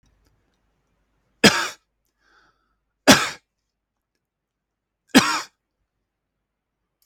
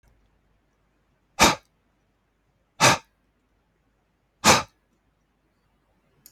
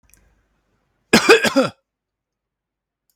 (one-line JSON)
{"three_cough_length": "7.1 s", "three_cough_amplitude": 32768, "three_cough_signal_mean_std_ratio": 0.21, "exhalation_length": "6.3 s", "exhalation_amplitude": 29152, "exhalation_signal_mean_std_ratio": 0.21, "cough_length": "3.2 s", "cough_amplitude": 32768, "cough_signal_mean_std_ratio": 0.28, "survey_phase": "beta (2021-08-13 to 2022-03-07)", "age": "45-64", "gender": "Male", "wearing_mask": "No", "symptom_none": true, "smoker_status": "Never smoked", "respiratory_condition_asthma": false, "respiratory_condition_other": false, "recruitment_source": "REACT", "submission_delay": "2 days", "covid_test_result": "Negative", "covid_test_method": "RT-qPCR", "influenza_a_test_result": "Negative", "influenza_b_test_result": "Negative"}